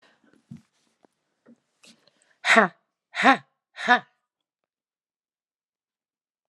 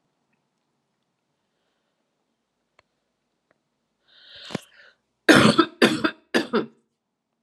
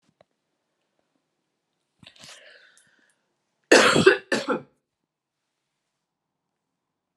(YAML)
exhalation_length: 6.5 s
exhalation_amplitude: 30152
exhalation_signal_mean_std_ratio: 0.21
three_cough_length: 7.4 s
three_cough_amplitude: 28650
three_cough_signal_mean_std_ratio: 0.24
cough_length: 7.2 s
cough_amplitude: 29738
cough_signal_mean_std_ratio: 0.22
survey_phase: alpha (2021-03-01 to 2021-08-12)
age: 45-64
gender: Female
wearing_mask: 'No'
symptom_cough_any: true
symptom_headache: true
symptom_onset: 5 days
smoker_status: Ex-smoker
respiratory_condition_asthma: false
respiratory_condition_other: false
recruitment_source: REACT
submission_delay: 1 day
covid_test_result: Negative
covid_test_method: RT-qPCR